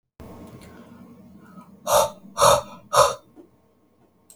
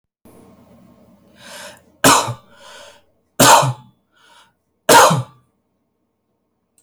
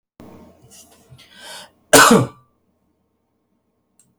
{"exhalation_length": "4.4 s", "exhalation_amplitude": 25592, "exhalation_signal_mean_std_ratio": 0.35, "three_cough_length": "6.8 s", "three_cough_amplitude": 32768, "three_cough_signal_mean_std_ratio": 0.31, "cough_length": "4.2 s", "cough_amplitude": 32768, "cough_signal_mean_std_ratio": 0.25, "survey_phase": "alpha (2021-03-01 to 2021-08-12)", "age": "18-44", "gender": "Male", "wearing_mask": "No", "symptom_headache": true, "symptom_onset": "6 days", "smoker_status": "Never smoked", "recruitment_source": "REACT", "submission_delay": "1 day", "covid_test_result": "Negative", "covid_test_method": "RT-qPCR"}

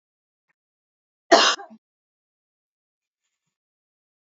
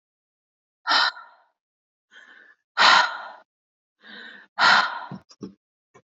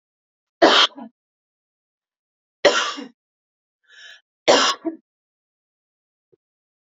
{"cough_length": "4.3 s", "cough_amplitude": 27920, "cough_signal_mean_std_ratio": 0.18, "exhalation_length": "6.1 s", "exhalation_amplitude": 27200, "exhalation_signal_mean_std_ratio": 0.33, "three_cough_length": "6.8 s", "three_cough_amplitude": 29582, "three_cough_signal_mean_std_ratio": 0.27, "survey_phase": "beta (2021-08-13 to 2022-03-07)", "age": "18-44", "gender": "Female", "wearing_mask": "No", "symptom_none": true, "smoker_status": "Current smoker (1 to 10 cigarettes per day)", "respiratory_condition_asthma": false, "respiratory_condition_other": false, "recruitment_source": "REACT", "submission_delay": "8 days", "covid_test_result": "Negative", "covid_test_method": "RT-qPCR", "influenza_a_test_result": "Negative", "influenza_b_test_result": "Negative"}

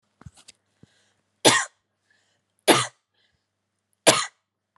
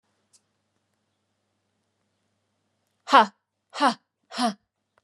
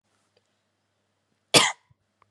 {"three_cough_length": "4.8 s", "three_cough_amplitude": 32187, "three_cough_signal_mean_std_ratio": 0.24, "exhalation_length": "5.0 s", "exhalation_amplitude": 22982, "exhalation_signal_mean_std_ratio": 0.21, "cough_length": "2.3 s", "cough_amplitude": 27943, "cough_signal_mean_std_ratio": 0.2, "survey_phase": "beta (2021-08-13 to 2022-03-07)", "age": "18-44", "gender": "Female", "wearing_mask": "No", "symptom_fatigue": true, "symptom_change_to_sense_of_smell_or_taste": true, "symptom_onset": "12 days", "smoker_status": "Never smoked", "respiratory_condition_asthma": false, "respiratory_condition_other": false, "recruitment_source": "REACT", "submission_delay": "6 days", "covid_test_result": "Negative", "covid_test_method": "RT-qPCR", "influenza_a_test_result": "Negative", "influenza_b_test_result": "Negative"}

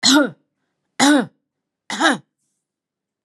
{"three_cough_length": "3.2 s", "three_cough_amplitude": 30467, "three_cough_signal_mean_std_ratio": 0.39, "survey_phase": "alpha (2021-03-01 to 2021-08-12)", "age": "45-64", "gender": "Female", "wearing_mask": "No", "symptom_none": true, "smoker_status": "Never smoked", "respiratory_condition_asthma": false, "respiratory_condition_other": false, "recruitment_source": "REACT", "submission_delay": "1 day", "covid_test_result": "Negative", "covid_test_method": "RT-qPCR"}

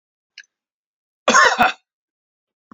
{"three_cough_length": "2.7 s", "three_cough_amplitude": 31963, "three_cough_signal_mean_std_ratio": 0.3, "survey_phase": "beta (2021-08-13 to 2022-03-07)", "age": "65+", "gender": "Male", "wearing_mask": "No", "symptom_none": true, "smoker_status": "Never smoked", "respiratory_condition_asthma": false, "respiratory_condition_other": false, "recruitment_source": "REACT", "submission_delay": "2 days", "covid_test_result": "Negative", "covid_test_method": "RT-qPCR", "influenza_a_test_result": "Negative", "influenza_b_test_result": "Negative"}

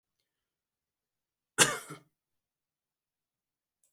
{"cough_length": "3.9 s", "cough_amplitude": 15330, "cough_signal_mean_std_ratio": 0.15, "survey_phase": "beta (2021-08-13 to 2022-03-07)", "age": "45-64", "wearing_mask": "No", "symptom_none": true, "smoker_status": "Never smoked", "respiratory_condition_asthma": true, "respiratory_condition_other": false, "recruitment_source": "REACT", "submission_delay": "1 day", "covid_test_result": "Negative", "covid_test_method": "RT-qPCR", "influenza_a_test_result": "Negative", "influenza_b_test_result": "Negative"}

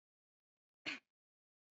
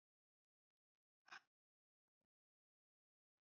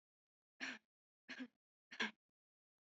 {"cough_length": "1.8 s", "cough_amplitude": 939, "cough_signal_mean_std_ratio": 0.2, "exhalation_length": "3.4 s", "exhalation_amplitude": 177, "exhalation_signal_mean_std_ratio": 0.13, "three_cough_length": "2.8 s", "three_cough_amplitude": 1395, "three_cough_signal_mean_std_ratio": 0.29, "survey_phase": "beta (2021-08-13 to 2022-03-07)", "age": "18-44", "gender": "Female", "wearing_mask": "Yes", "symptom_none": true, "smoker_status": "Never smoked", "respiratory_condition_asthma": false, "respiratory_condition_other": false, "recruitment_source": "REACT", "submission_delay": "7 days", "covid_test_result": "Negative", "covid_test_method": "RT-qPCR", "influenza_a_test_result": "Negative", "influenza_b_test_result": "Negative"}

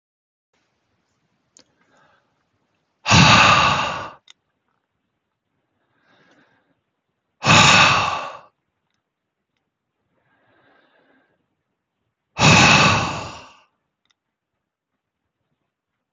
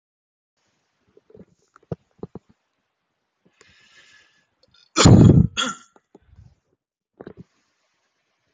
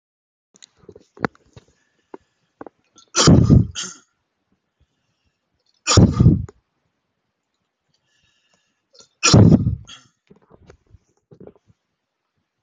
{"exhalation_length": "16.1 s", "exhalation_amplitude": 32708, "exhalation_signal_mean_std_ratio": 0.31, "cough_length": "8.5 s", "cough_amplitude": 27287, "cough_signal_mean_std_ratio": 0.21, "three_cough_length": "12.6 s", "three_cough_amplitude": 32005, "three_cough_signal_mean_std_ratio": 0.27, "survey_phase": "beta (2021-08-13 to 2022-03-07)", "age": "18-44", "gender": "Male", "wearing_mask": "No", "symptom_none": true, "smoker_status": "Ex-smoker", "respiratory_condition_asthma": false, "respiratory_condition_other": false, "recruitment_source": "REACT", "submission_delay": "1 day", "covid_test_result": "Negative", "covid_test_method": "RT-qPCR"}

